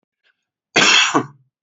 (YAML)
cough_length: 1.6 s
cough_amplitude: 31525
cough_signal_mean_std_ratio: 0.44
survey_phase: alpha (2021-03-01 to 2021-08-12)
age: 45-64
gender: Male
wearing_mask: 'No'
symptom_none: true
smoker_status: Never smoked
respiratory_condition_asthma: false
respiratory_condition_other: false
recruitment_source: REACT
submission_delay: 3 days
covid_test_result: Negative
covid_test_method: RT-qPCR